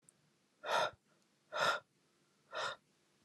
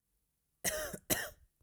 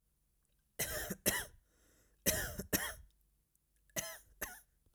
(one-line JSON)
{"exhalation_length": "3.2 s", "exhalation_amplitude": 3274, "exhalation_signal_mean_std_ratio": 0.38, "cough_length": "1.6 s", "cough_amplitude": 5688, "cough_signal_mean_std_ratio": 0.42, "three_cough_length": "4.9 s", "three_cough_amplitude": 5509, "three_cough_signal_mean_std_ratio": 0.4, "survey_phase": "alpha (2021-03-01 to 2021-08-12)", "age": "18-44", "gender": "Male", "wearing_mask": "No", "symptom_none": true, "smoker_status": "Never smoked", "respiratory_condition_asthma": false, "respiratory_condition_other": false, "recruitment_source": "REACT", "submission_delay": "2 days", "covid_test_result": "Negative", "covid_test_method": "RT-qPCR"}